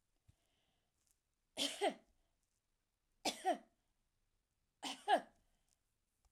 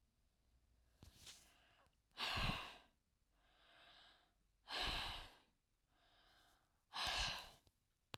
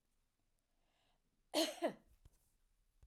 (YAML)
three_cough_length: 6.3 s
three_cough_amplitude: 2870
three_cough_signal_mean_std_ratio: 0.26
exhalation_length: 8.2 s
exhalation_amplitude: 1380
exhalation_signal_mean_std_ratio: 0.4
cough_length: 3.1 s
cough_amplitude: 2185
cough_signal_mean_std_ratio: 0.26
survey_phase: beta (2021-08-13 to 2022-03-07)
age: 45-64
gender: Female
wearing_mask: 'No'
symptom_none: true
smoker_status: Never smoked
respiratory_condition_asthma: false
respiratory_condition_other: false
recruitment_source: REACT
submission_delay: 3 days
covid_test_result: Negative
covid_test_method: RT-qPCR
influenza_a_test_result: Negative
influenza_b_test_result: Negative